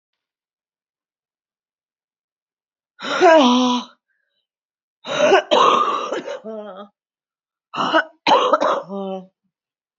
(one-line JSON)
{"exhalation_length": "10.0 s", "exhalation_amplitude": 28599, "exhalation_signal_mean_std_ratio": 0.42, "survey_phase": "beta (2021-08-13 to 2022-03-07)", "age": "45-64", "gender": "Female", "wearing_mask": "No", "symptom_cough_any": true, "symptom_runny_or_blocked_nose": true, "smoker_status": "Never smoked", "respiratory_condition_asthma": false, "respiratory_condition_other": false, "recruitment_source": "Test and Trace", "submission_delay": "1 day", "covid_test_result": "Positive", "covid_test_method": "RT-qPCR", "covid_ct_value": 12.8, "covid_ct_gene": "ORF1ab gene", "covid_ct_mean": 13.3, "covid_viral_load": "44000000 copies/ml", "covid_viral_load_category": "High viral load (>1M copies/ml)"}